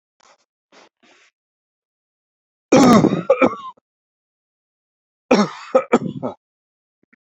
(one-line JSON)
{"cough_length": "7.3 s", "cough_amplitude": 31552, "cough_signal_mean_std_ratio": 0.31, "survey_phase": "beta (2021-08-13 to 2022-03-07)", "age": "45-64", "gender": "Male", "wearing_mask": "No", "symptom_shortness_of_breath": true, "symptom_headache": true, "symptom_onset": "12 days", "smoker_status": "Never smoked", "respiratory_condition_asthma": false, "respiratory_condition_other": false, "recruitment_source": "REACT", "submission_delay": "3 days", "covid_test_result": "Negative", "covid_test_method": "RT-qPCR", "influenza_a_test_result": "Negative", "influenza_b_test_result": "Negative"}